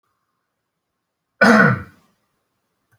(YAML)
cough_length: 3.0 s
cough_amplitude: 29244
cough_signal_mean_std_ratio: 0.28
survey_phase: beta (2021-08-13 to 2022-03-07)
age: 45-64
gender: Male
wearing_mask: 'No'
symptom_none: true
smoker_status: Never smoked
respiratory_condition_asthma: false
respiratory_condition_other: false
recruitment_source: REACT
submission_delay: 1 day
covid_test_result: Negative
covid_test_method: RT-qPCR